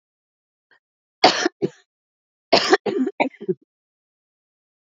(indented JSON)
{
  "cough_length": "4.9 s",
  "cough_amplitude": 32768,
  "cough_signal_mean_std_ratio": 0.3,
  "survey_phase": "beta (2021-08-13 to 2022-03-07)",
  "age": "45-64",
  "gender": "Female",
  "wearing_mask": "No",
  "symptom_runny_or_blocked_nose": true,
  "symptom_shortness_of_breath": true,
  "symptom_fatigue": true,
  "smoker_status": "Never smoked",
  "respiratory_condition_asthma": true,
  "respiratory_condition_other": false,
  "recruitment_source": "REACT",
  "submission_delay": "3 days",
  "covid_test_result": "Negative",
  "covid_test_method": "RT-qPCR",
  "influenza_a_test_result": "Negative",
  "influenza_b_test_result": "Negative"
}